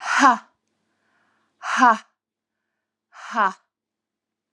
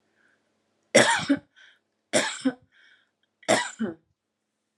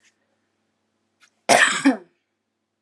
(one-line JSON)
{"exhalation_length": "4.5 s", "exhalation_amplitude": 28287, "exhalation_signal_mean_std_ratio": 0.31, "three_cough_length": "4.8 s", "three_cough_amplitude": 25490, "three_cough_signal_mean_std_ratio": 0.33, "cough_length": "2.8 s", "cough_amplitude": 31700, "cough_signal_mean_std_ratio": 0.29, "survey_phase": "alpha (2021-03-01 to 2021-08-12)", "age": "18-44", "gender": "Female", "wearing_mask": "Yes", "symptom_none": true, "smoker_status": "Never smoked", "respiratory_condition_asthma": false, "respiratory_condition_other": false, "recruitment_source": "REACT", "submission_delay": "2 days", "covid_test_result": "Negative", "covid_test_method": "RT-qPCR"}